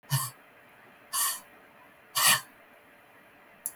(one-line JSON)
{"exhalation_length": "3.8 s", "exhalation_amplitude": 11696, "exhalation_signal_mean_std_ratio": 0.37, "survey_phase": "beta (2021-08-13 to 2022-03-07)", "age": "65+", "gender": "Female", "wearing_mask": "No", "symptom_none": true, "smoker_status": "Ex-smoker", "respiratory_condition_asthma": false, "respiratory_condition_other": false, "recruitment_source": "REACT", "submission_delay": "1 day", "covid_test_result": "Negative", "covid_test_method": "RT-qPCR"}